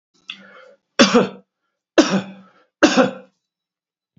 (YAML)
three_cough_length: 4.2 s
three_cough_amplitude: 32767
three_cough_signal_mean_std_ratio: 0.33
survey_phase: beta (2021-08-13 to 2022-03-07)
age: 65+
gender: Male
wearing_mask: 'No'
symptom_cough_any: true
symptom_runny_or_blocked_nose: true
smoker_status: Never smoked
respiratory_condition_asthma: false
respiratory_condition_other: false
recruitment_source: Test and Trace
submission_delay: 2 days
covid_test_result: Positive
covid_test_method: RT-qPCR
covid_ct_value: 17.8
covid_ct_gene: ORF1ab gene
covid_ct_mean: 18.4
covid_viral_load: 920000 copies/ml
covid_viral_load_category: Low viral load (10K-1M copies/ml)